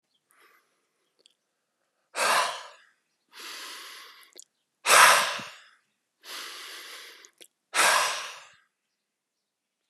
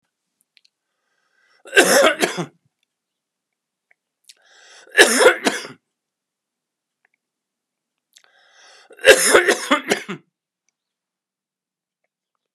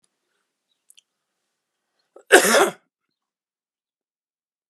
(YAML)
exhalation_length: 9.9 s
exhalation_amplitude: 24687
exhalation_signal_mean_std_ratio: 0.31
three_cough_length: 12.5 s
three_cough_amplitude: 32768
three_cough_signal_mean_std_ratio: 0.28
cough_length: 4.7 s
cough_amplitude: 32768
cough_signal_mean_std_ratio: 0.2
survey_phase: beta (2021-08-13 to 2022-03-07)
age: 65+
gender: Male
wearing_mask: 'No'
symptom_cough_any: true
symptom_runny_or_blocked_nose: true
symptom_fatigue: true
symptom_change_to_sense_of_smell_or_taste: true
symptom_other: true
smoker_status: Never smoked
respiratory_condition_asthma: false
respiratory_condition_other: false
recruitment_source: Test and Trace
submission_delay: 1 day
covid_test_result: Positive
covid_test_method: RT-qPCR
covid_ct_value: 18.3
covid_ct_gene: ORF1ab gene
covid_ct_mean: 19.5
covid_viral_load: 410000 copies/ml
covid_viral_load_category: Low viral load (10K-1M copies/ml)